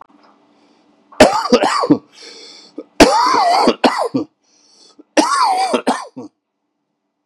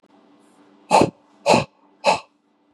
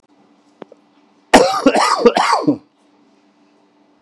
{"three_cough_length": "7.3 s", "three_cough_amplitude": 32768, "three_cough_signal_mean_std_ratio": 0.48, "exhalation_length": "2.7 s", "exhalation_amplitude": 27147, "exhalation_signal_mean_std_ratio": 0.34, "cough_length": "4.0 s", "cough_amplitude": 32768, "cough_signal_mean_std_ratio": 0.41, "survey_phase": "beta (2021-08-13 to 2022-03-07)", "age": "45-64", "gender": "Male", "wearing_mask": "No", "symptom_cough_any": true, "symptom_onset": "11 days", "smoker_status": "Current smoker (1 to 10 cigarettes per day)", "respiratory_condition_asthma": false, "respiratory_condition_other": false, "recruitment_source": "REACT", "submission_delay": "2 days", "covid_test_result": "Negative", "covid_test_method": "RT-qPCR", "influenza_a_test_result": "Negative", "influenza_b_test_result": "Negative"}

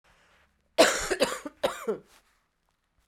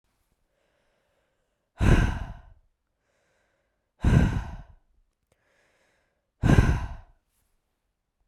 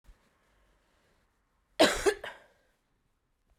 {"three_cough_length": "3.1 s", "three_cough_amplitude": 17436, "three_cough_signal_mean_std_ratio": 0.35, "exhalation_length": "8.3 s", "exhalation_amplitude": 18385, "exhalation_signal_mean_std_ratio": 0.31, "cough_length": "3.6 s", "cough_amplitude": 14418, "cough_signal_mean_std_ratio": 0.23, "survey_phase": "beta (2021-08-13 to 2022-03-07)", "age": "45-64", "gender": "Female", "wearing_mask": "No", "symptom_cough_any": true, "symptom_runny_or_blocked_nose": true, "symptom_abdominal_pain": true, "symptom_fatigue": true, "symptom_onset": "3 days", "smoker_status": "Never smoked", "respiratory_condition_asthma": true, "respiratory_condition_other": false, "recruitment_source": "Test and Trace", "submission_delay": "2 days", "covid_test_result": "Positive", "covid_test_method": "RT-qPCR", "covid_ct_value": 26.9, "covid_ct_gene": "N gene"}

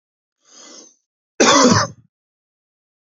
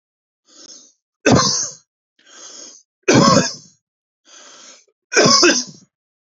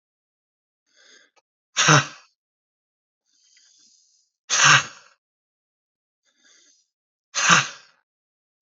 {"cough_length": "3.2 s", "cough_amplitude": 31093, "cough_signal_mean_std_ratio": 0.32, "three_cough_length": "6.2 s", "three_cough_amplitude": 32767, "three_cough_signal_mean_std_ratio": 0.39, "exhalation_length": "8.6 s", "exhalation_amplitude": 32629, "exhalation_signal_mean_std_ratio": 0.25, "survey_phase": "beta (2021-08-13 to 2022-03-07)", "age": "18-44", "gender": "Male", "wearing_mask": "No", "symptom_none": true, "smoker_status": "Never smoked", "respiratory_condition_asthma": true, "respiratory_condition_other": false, "recruitment_source": "REACT", "submission_delay": "2 days", "covid_test_result": "Negative", "covid_test_method": "RT-qPCR", "influenza_a_test_result": "Negative", "influenza_b_test_result": "Negative"}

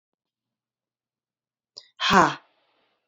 {"exhalation_length": "3.1 s", "exhalation_amplitude": 25104, "exhalation_signal_mean_std_ratio": 0.23, "survey_phase": "beta (2021-08-13 to 2022-03-07)", "age": "45-64", "gender": "Female", "wearing_mask": "No", "symptom_cough_any": true, "symptom_runny_or_blocked_nose": true, "symptom_sore_throat": true, "symptom_other": true, "smoker_status": "Never smoked", "respiratory_condition_asthma": true, "respiratory_condition_other": false, "recruitment_source": "Test and Trace", "submission_delay": "0 days", "covid_test_result": "Positive", "covid_test_method": "LFT"}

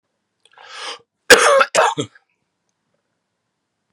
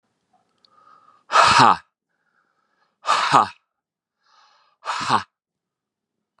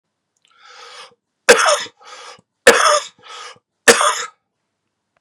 {"cough_length": "3.9 s", "cough_amplitude": 32768, "cough_signal_mean_std_ratio": 0.31, "exhalation_length": "6.4 s", "exhalation_amplitude": 32767, "exhalation_signal_mean_std_ratio": 0.31, "three_cough_length": "5.2 s", "three_cough_amplitude": 32768, "three_cough_signal_mean_std_ratio": 0.34, "survey_phase": "beta (2021-08-13 to 2022-03-07)", "age": "18-44", "gender": "Male", "wearing_mask": "No", "symptom_cough_any": true, "symptom_new_continuous_cough": true, "symptom_runny_or_blocked_nose": true, "symptom_sore_throat": true, "symptom_fatigue": true, "symptom_onset": "4 days", "smoker_status": "Never smoked", "respiratory_condition_asthma": false, "respiratory_condition_other": false, "recruitment_source": "Test and Trace", "submission_delay": "2 days", "covid_test_result": "Positive", "covid_test_method": "RT-qPCR", "covid_ct_value": 20.5, "covid_ct_gene": "N gene", "covid_ct_mean": 21.3, "covid_viral_load": "110000 copies/ml", "covid_viral_load_category": "Low viral load (10K-1M copies/ml)"}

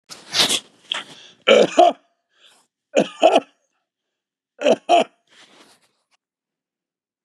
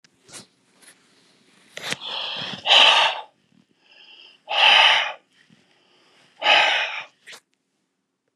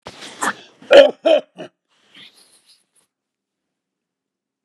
{"three_cough_length": "7.2 s", "three_cough_amplitude": 32670, "three_cough_signal_mean_std_ratio": 0.33, "exhalation_length": "8.4 s", "exhalation_amplitude": 31179, "exhalation_signal_mean_std_ratio": 0.39, "cough_length": "4.6 s", "cough_amplitude": 32768, "cough_signal_mean_std_ratio": 0.24, "survey_phase": "beta (2021-08-13 to 2022-03-07)", "age": "65+", "gender": "Male", "wearing_mask": "No", "symptom_none": true, "smoker_status": "Ex-smoker", "respiratory_condition_asthma": false, "respiratory_condition_other": false, "recruitment_source": "REACT", "submission_delay": "2 days", "covid_test_result": "Negative", "covid_test_method": "RT-qPCR", "influenza_a_test_result": "Negative", "influenza_b_test_result": "Negative"}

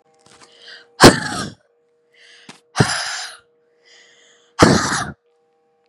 {"exhalation_length": "5.9 s", "exhalation_amplitude": 32768, "exhalation_signal_mean_std_ratio": 0.3, "survey_phase": "beta (2021-08-13 to 2022-03-07)", "age": "18-44", "gender": "Female", "wearing_mask": "No", "symptom_none": true, "symptom_onset": "8 days", "smoker_status": "Never smoked", "respiratory_condition_asthma": false, "respiratory_condition_other": false, "recruitment_source": "REACT", "submission_delay": "1 day", "covid_test_result": "Negative", "covid_test_method": "RT-qPCR", "influenza_a_test_result": "Negative", "influenza_b_test_result": "Negative"}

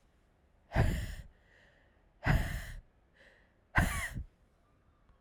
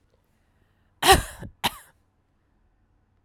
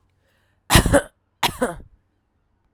{"exhalation_length": "5.2 s", "exhalation_amplitude": 8762, "exhalation_signal_mean_std_ratio": 0.39, "cough_length": "3.2 s", "cough_amplitude": 32767, "cough_signal_mean_std_ratio": 0.22, "three_cough_length": "2.7 s", "three_cough_amplitude": 32768, "three_cough_signal_mean_std_ratio": 0.31, "survey_phase": "alpha (2021-03-01 to 2021-08-12)", "age": "45-64", "gender": "Female", "wearing_mask": "No", "symptom_cough_any": true, "symptom_fatigue": true, "symptom_headache": true, "smoker_status": "Never smoked", "respiratory_condition_asthma": false, "respiratory_condition_other": false, "recruitment_source": "Test and Trace", "submission_delay": "2 days", "covid_test_result": "Positive", "covid_test_method": "RT-qPCR"}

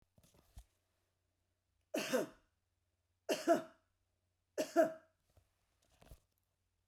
{"three_cough_length": "6.9 s", "three_cough_amplitude": 4038, "three_cough_signal_mean_std_ratio": 0.26, "survey_phase": "beta (2021-08-13 to 2022-03-07)", "age": "65+", "gender": "Female", "wearing_mask": "No", "symptom_none": true, "smoker_status": "Never smoked", "respiratory_condition_asthma": false, "respiratory_condition_other": true, "recruitment_source": "REACT", "submission_delay": "0 days", "covid_test_result": "Negative", "covid_test_method": "RT-qPCR"}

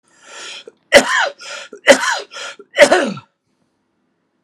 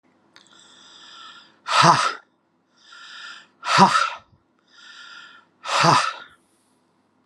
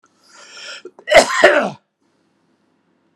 {"three_cough_length": "4.4 s", "three_cough_amplitude": 32768, "three_cough_signal_mean_std_ratio": 0.37, "exhalation_length": "7.3 s", "exhalation_amplitude": 29256, "exhalation_signal_mean_std_ratio": 0.36, "cough_length": "3.2 s", "cough_amplitude": 32768, "cough_signal_mean_std_ratio": 0.33, "survey_phase": "alpha (2021-03-01 to 2021-08-12)", "age": "45-64", "gender": "Male", "wearing_mask": "No", "symptom_none": true, "smoker_status": "Never smoked", "respiratory_condition_asthma": true, "respiratory_condition_other": false, "recruitment_source": "REACT", "submission_delay": "3 days", "covid_test_result": "Negative", "covid_test_method": "RT-qPCR"}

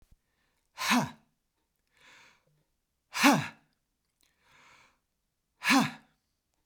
{"exhalation_length": "6.7 s", "exhalation_amplitude": 12150, "exhalation_signal_mean_std_ratio": 0.27, "survey_phase": "beta (2021-08-13 to 2022-03-07)", "age": "45-64", "gender": "Male", "wearing_mask": "No", "symptom_none": true, "smoker_status": "Never smoked", "respiratory_condition_asthma": false, "respiratory_condition_other": false, "recruitment_source": "REACT", "submission_delay": "3 days", "covid_test_result": "Negative", "covid_test_method": "RT-qPCR", "influenza_a_test_result": "Negative", "influenza_b_test_result": "Negative"}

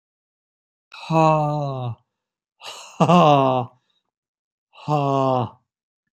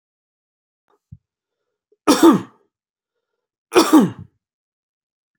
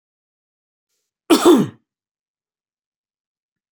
{"exhalation_length": "6.1 s", "exhalation_amplitude": 28323, "exhalation_signal_mean_std_ratio": 0.43, "three_cough_length": "5.4 s", "three_cough_amplitude": 30026, "three_cough_signal_mean_std_ratio": 0.27, "cough_length": "3.7 s", "cough_amplitude": 29702, "cough_signal_mean_std_ratio": 0.24, "survey_phase": "beta (2021-08-13 to 2022-03-07)", "age": "45-64", "gender": "Male", "wearing_mask": "No", "symptom_runny_or_blocked_nose": true, "symptom_sore_throat": true, "symptom_onset": "10 days", "smoker_status": "Ex-smoker", "respiratory_condition_asthma": false, "respiratory_condition_other": false, "recruitment_source": "REACT", "submission_delay": "3 days", "covid_test_result": "Positive", "covid_test_method": "RT-qPCR", "covid_ct_value": 23.0, "covid_ct_gene": "N gene", "influenza_a_test_result": "Negative", "influenza_b_test_result": "Negative"}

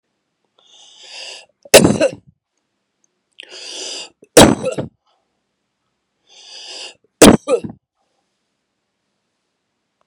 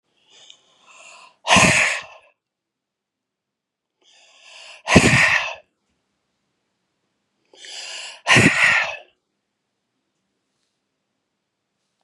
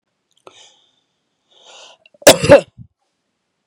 {"three_cough_length": "10.1 s", "three_cough_amplitude": 32768, "three_cough_signal_mean_std_ratio": 0.24, "exhalation_length": "12.0 s", "exhalation_amplitude": 32768, "exhalation_signal_mean_std_ratio": 0.31, "cough_length": "3.7 s", "cough_amplitude": 32768, "cough_signal_mean_std_ratio": 0.21, "survey_phase": "beta (2021-08-13 to 2022-03-07)", "age": "65+", "gender": "Female", "wearing_mask": "No", "symptom_none": true, "smoker_status": "Never smoked", "respiratory_condition_asthma": false, "respiratory_condition_other": false, "recruitment_source": "REACT", "submission_delay": "2 days", "covid_test_result": "Negative", "covid_test_method": "RT-qPCR", "influenza_a_test_result": "Negative", "influenza_b_test_result": "Negative"}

